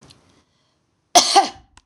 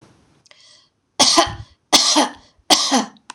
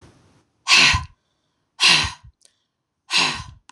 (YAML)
cough_length: 1.9 s
cough_amplitude: 26028
cough_signal_mean_std_ratio: 0.3
three_cough_length: 3.3 s
three_cough_amplitude: 26028
three_cough_signal_mean_std_ratio: 0.45
exhalation_length: 3.7 s
exhalation_amplitude: 25825
exhalation_signal_mean_std_ratio: 0.39
survey_phase: beta (2021-08-13 to 2022-03-07)
age: 45-64
gender: Female
wearing_mask: 'No'
symptom_none: true
smoker_status: Never smoked
respiratory_condition_asthma: false
respiratory_condition_other: false
recruitment_source: REACT
submission_delay: 1 day
covid_test_result: Negative
covid_test_method: RT-qPCR
influenza_a_test_result: Negative
influenza_b_test_result: Negative